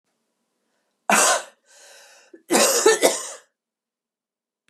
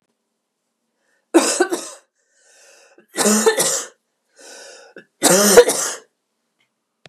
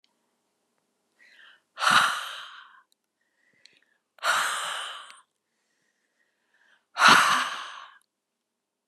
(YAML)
cough_length: 4.7 s
cough_amplitude: 27963
cough_signal_mean_std_ratio: 0.38
three_cough_length: 7.1 s
three_cough_amplitude: 32768
three_cough_signal_mean_std_ratio: 0.37
exhalation_length: 8.9 s
exhalation_amplitude: 25049
exhalation_signal_mean_std_ratio: 0.32
survey_phase: beta (2021-08-13 to 2022-03-07)
age: 45-64
gender: Female
wearing_mask: 'No'
symptom_none: true
smoker_status: Ex-smoker
respiratory_condition_asthma: false
respiratory_condition_other: false
recruitment_source: REACT
submission_delay: 2 days
covid_test_result: Negative
covid_test_method: RT-qPCR
influenza_a_test_result: Negative
influenza_b_test_result: Negative